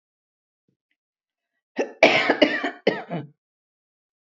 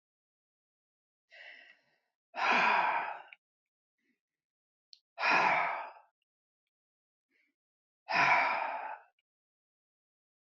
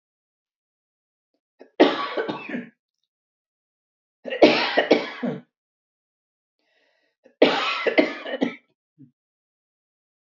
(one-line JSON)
{"cough_length": "4.3 s", "cough_amplitude": 32768, "cough_signal_mean_std_ratio": 0.32, "exhalation_length": "10.5 s", "exhalation_amplitude": 6511, "exhalation_signal_mean_std_ratio": 0.37, "three_cough_length": "10.3 s", "three_cough_amplitude": 27687, "three_cough_signal_mean_std_ratio": 0.32, "survey_phase": "beta (2021-08-13 to 2022-03-07)", "age": "65+", "gender": "Female", "wearing_mask": "No", "symptom_none": true, "smoker_status": "Never smoked", "respiratory_condition_asthma": false, "respiratory_condition_other": false, "recruitment_source": "REACT", "submission_delay": "2 days", "covid_test_result": "Negative", "covid_test_method": "RT-qPCR", "influenza_a_test_result": "Negative", "influenza_b_test_result": "Negative"}